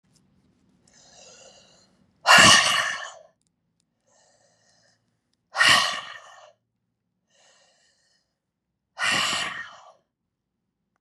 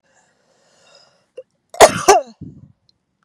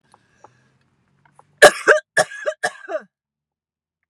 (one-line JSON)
{"exhalation_length": "11.0 s", "exhalation_amplitude": 28652, "exhalation_signal_mean_std_ratio": 0.28, "cough_length": "3.2 s", "cough_amplitude": 32768, "cough_signal_mean_std_ratio": 0.24, "three_cough_length": "4.1 s", "three_cough_amplitude": 32768, "three_cough_signal_mean_std_ratio": 0.24, "survey_phase": "beta (2021-08-13 to 2022-03-07)", "age": "45-64", "gender": "Female", "wearing_mask": "No", "symptom_none": true, "smoker_status": "Never smoked", "respiratory_condition_asthma": false, "respiratory_condition_other": false, "recruitment_source": "REACT", "submission_delay": "1 day", "covid_test_result": "Negative", "covid_test_method": "RT-qPCR"}